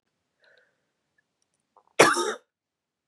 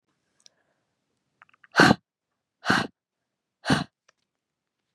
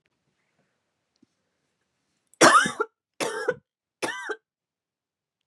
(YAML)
cough_length: 3.1 s
cough_amplitude: 31849
cough_signal_mean_std_ratio: 0.22
exhalation_length: 4.9 s
exhalation_amplitude: 28644
exhalation_signal_mean_std_ratio: 0.23
three_cough_length: 5.5 s
three_cough_amplitude: 28442
three_cough_signal_mean_std_ratio: 0.25
survey_phase: beta (2021-08-13 to 2022-03-07)
age: 18-44
gender: Female
wearing_mask: 'No'
symptom_cough_any: true
symptom_runny_or_blocked_nose: true
symptom_shortness_of_breath: true
symptom_sore_throat: true
symptom_fatigue: true
symptom_headache: true
symptom_onset: 3 days
smoker_status: Ex-smoker
respiratory_condition_asthma: false
respiratory_condition_other: false
recruitment_source: Test and Trace
submission_delay: 1 day
covid_test_result: Positive
covid_test_method: RT-qPCR
covid_ct_value: 33.1
covid_ct_gene: ORF1ab gene
covid_ct_mean: 34.0
covid_viral_load: 7 copies/ml
covid_viral_load_category: Minimal viral load (< 10K copies/ml)